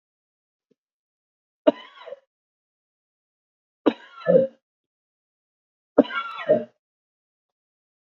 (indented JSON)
{
  "three_cough_length": "8.0 s",
  "three_cough_amplitude": 27382,
  "three_cough_signal_mean_std_ratio": 0.21,
  "survey_phase": "beta (2021-08-13 to 2022-03-07)",
  "age": "65+",
  "gender": "Male",
  "wearing_mask": "No",
  "symptom_none": true,
  "symptom_onset": "12 days",
  "smoker_status": "Ex-smoker",
  "respiratory_condition_asthma": false,
  "respiratory_condition_other": false,
  "recruitment_source": "REACT",
  "submission_delay": "2 days",
  "covid_test_result": "Negative",
  "covid_test_method": "RT-qPCR",
  "influenza_a_test_result": "Negative",
  "influenza_b_test_result": "Negative"
}